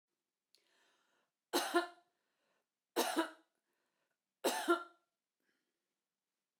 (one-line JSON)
{"three_cough_length": "6.6 s", "three_cough_amplitude": 4134, "three_cough_signal_mean_std_ratio": 0.28, "survey_phase": "beta (2021-08-13 to 2022-03-07)", "age": "45-64", "gender": "Female", "wearing_mask": "No", "symptom_runny_or_blocked_nose": true, "symptom_onset": "13 days", "smoker_status": "Never smoked", "respiratory_condition_asthma": false, "respiratory_condition_other": false, "recruitment_source": "REACT", "submission_delay": "1 day", "covid_test_result": "Negative", "covid_test_method": "RT-qPCR"}